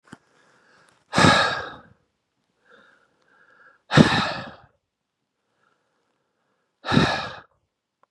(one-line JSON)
{"exhalation_length": "8.1 s", "exhalation_amplitude": 32767, "exhalation_signal_mean_std_ratio": 0.29, "survey_phase": "beta (2021-08-13 to 2022-03-07)", "age": "45-64", "gender": "Male", "wearing_mask": "No", "symptom_cough_any": true, "symptom_runny_or_blocked_nose": true, "symptom_fatigue": true, "symptom_headache": true, "symptom_onset": "5 days", "smoker_status": "Never smoked", "respiratory_condition_asthma": false, "respiratory_condition_other": false, "recruitment_source": "Test and Trace", "submission_delay": "1 day", "covid_test_result": "Positive", "covid_test_method": "RT-qPCR", "covid_ct_value": 14.5, "covid_ct_gene": "N gene", "covid_ct_mean": 15.1, "covid_viral_load": "11000000 copies/ml", "covid_viral_load_category": "High viral load (>1M copies/ml)"}